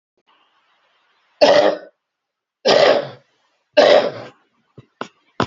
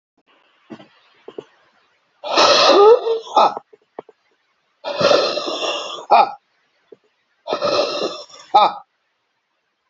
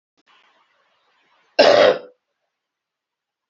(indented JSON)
{
  "three_cough_length": "5.5 s",
  "three_cough_amplitude": 31546,
  "three_cough_signal_mean_std_ratio": 0.38,
  "exhalation_length": "9.9 s",
  "exhalation_amplitude": 31505,
  "exhalation_signal_mean_std_ratio": 0.42,
  "cough_length": "3.5 s",
  "cough_amplitude": 27963,
  "cough_signal_mean_std_ratio": 0.27,
  "survey_phase": "alpha (2021-03-01 to 2021-08-12)",
  "age": "65+",
  "gender": "Male",
  "wearing_mask": "No",
  "symptom_none": true,
  "smoker_status": "Ex-smoker",
  "respiratory_condition_asthma": false,
  "respiratory_condition_other": false,
  "recruitment_source": "REACT",
  "submission_delay": "4 days",
  "covid_test_result": "Negative",
  "covid_test_method": "RT-qPCR"
}